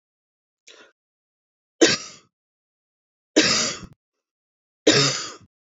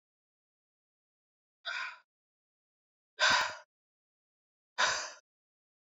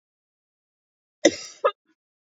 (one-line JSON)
{"three_cough_length": "5.7 s", "three_cough_amplitude": 27134, "three_cough_signal_mean_std_ratio": 0.31, "exhalation_length": "5.8 s", "exhalation_amplitude": 6159, "exhalation_signal_mean_std_ratio": 0.28, "cough_length": "2.2 s", "cough_amplitude": 24787, "cough_signal_mean_std_ratio": 0.2, "survey_phase": "beta (2021-08-13 to 2022-03-07)", "age": "18-44", "gender": "Female", "wearing_mask": "No", "symptom_cough_any": true, "symptom_fatigue": true, "symptom_headache": true, "symptom_change_to_sense_of_smell_or_taste": true, "symptom_onset": "4 days", "smoker_status": "Ex-smoker", "respiratory_condition_asthma": false, "respiratory_condition_other": false, "recruitment_source": "Test and Trace", "submission_delay": "2 days", "covid_test_result": "Positive", "covid_test_method": "RT-qPCR", "covid_ct_value": 27.5, "covid_ct_gene": "ORF1ab gene", "covid_ct_mean": 28.3, "covid_viral_load": "520 copies/ml", "covid_viral_load_category": "Minimal viral load (< 10K copies/ml)"}